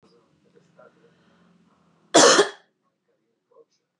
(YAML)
cough_length: 4.0 s
cough_amplitude: 26025
cough_signal_mean_std_ratio: 0.23
survey_phase: beta (2021-08-13 to 2022-03-07)
age: 45-64
gender: Female
wearing_mask: 'No'
symptom_fatigue: true
symptom_headache: true
symptom_onset: 13 days
smoker_status: Never smoked
respiratory_condition_asthma: true
respiratory_condition_other: false
recruitment_source: REACT
submission_delay: 2 days
covid_test_result: Negative
covid_test_method: RT-qPCR
influenza_a_test_result: Negative
influenza_b_test_result: Negative